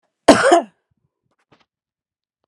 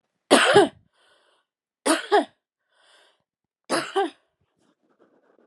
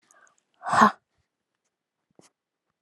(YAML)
cough_length: 2.5 s
cough_amplitude: 32768
cough_signal_mean_std_ratio: 0.28
three_cough_length: 5.5 s
three_cough_amplitude: 29876
three_cough_signal_mean_std_ratio: 0.31
exhalation_length: 2.8 s
exhalation_amplitude: 25645
exhalation_signal_mean_std_ratio: 0.22
survey_phase: alpha (2021-03-01 to 2021-08-12)
age: 18-44
gender: Female
wearing_mask: 'No'
symptom_headache: true
smoker_status: Current smoker (e-cigarettes or vapes only)
respiratory_condition_asthma: true
respiratory_condition_other: false
recruitment_source: REACT
submission_delay: 1 day
covid_test_result: Negative
covid_test_method: RT-qPCR